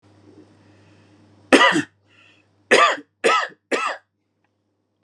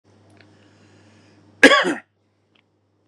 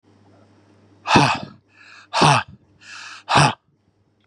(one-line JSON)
{"three_cough_length": "5.0 s", "three_cough_amplitude": 32767, "three_cough_signal_mean_std_ratio": 0.34, "cough_length": "3.1 s", "cough_amplitude": 32768, "cough_signal_mean_std_ratio": 0.23, "exhalation_length": "4.3 s", "exhalation_amplitude": 29697, "exhalation_signal_mean_std_ratio": 0.37, "survey_phase": "beta (2021-08-13 to 2022-03-07)", "age": "45-64", "gender": "Male", "wearing_mask": "No", "symptom_cough_any": true, "symptom_runny_or_blocked_nose": true, "symptom_shortness_of_breath": true, "symptom_abdominal_pain": true, "symptom_change_to_sense_of_smell_or_taste": true, "symptom_loss_of_taste": true, "smoker_status": "Ex-smoker", "respiratory_condition_asthma": true, "respiratory_condition_other": false, "recruitment_source": "REACT", "submission_delay": "2 days", "covid_test_result": "Negative", "covid_test_method": "RT-qPCR", "influenza_a_test_result": "Negative", "influenza_b_test_result": "Negative"}